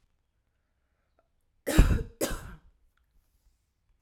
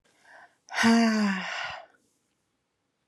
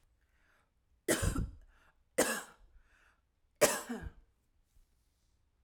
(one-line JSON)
{"cough_length": "4.0 s", "cough_amplitude": 15155, "cough_signal_mean_std_ratio": 0.25, "exhalation_length": "3.1 s", "exhalation_amplitude": 10569, "exhalation_signal_mean_std_ratio": 0.47, "three_cough_length": "5.6 s", "three_cough_amplitude": 10302, "three_cough_signal_mean_std_ratio": 0.31, "survey_phase": "alpha (2021-03-01 to 2021-08-12)", "age": "18-44", "gender": "Female", "wearing_mask": "No", "symptom_none": true, "smoker_status": "Never smoked", "respiratory_condition_asthma": false, "respiratory_condition_other": false, "recruitment_source": "REACT", "submission_delay": "2 days", "covid_test_result": "Negative", "covid_test_method": "RT-qPCR"}